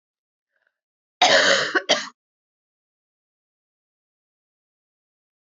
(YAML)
cough_length: 5.5 s
cough_amplitude: 22779
cough_signal_mean_std_ratio: 0.27
survey_phase: beta (2021-08-13 to 2022-03-07)
age: 65+
gender: Female
wearing_mask: 'No'
symptom_runny_or_blocked_nose: true
symptom_change_to_sense_of_smell_or_taste: true
symptom_loss_of_taste: true
symptom_onset: 4 days
smoker_status: Never smoked
respiratory_condition_asthma: false
respiratory_condition_other: false
recruitment_source: Test and Trace
submission_delay: 2 days
covid_test_result: Positive
covid_test_method: RT-qPCR